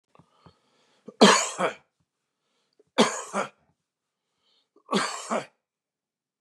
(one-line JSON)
{"three_cough_length": "6.4 s", "three_cough_amplitude": 27067, "three_cough_signal_mean_std_ratio": 0.28, "survey_phase": "beta (2021-08-13 to 2022-03-07)", "age": "65+", "gender": "Male", "wearing_mask": "No", "symptom_none": true, "symptom_onset": "12 days", "smoker_status": "Ex-smoker", "respiratory_condition_asthma": false, "respiratory_condition_other": false, "recruitment_source": "REACT", "submission_delay": "2 days", "covid_test_result": "Negative", "covid_test_method": "RT-qPCR", "influenza_a_test_result": "Negative", "influenza_b_test_result": "Negative"}